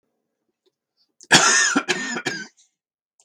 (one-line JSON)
{"cough_length": "3.2 s", "cough_amplitude": 32768, "cough_signal_mean_std_ratio": 0.39, "survey_phase": "beta (2021-08-13 to 2022-03-07)", "age": "65+", "gender": "Male", "wearing_mask": "No", "symptom_cough_any": true, "symptom_onset": "3 days", "smoker_status": "Ex-smoker", "respiratory_condition_asthma": false, "respiratory_condition_other": false, "recruitment_source": "Test and Trace", "submission_delay": "2 days", "covid_test_result": "Positive", "covid_test_method": "RT-qPCR", "covid_ct_value": 16.2, "covid_ct_gene": "ORF1ab gene"}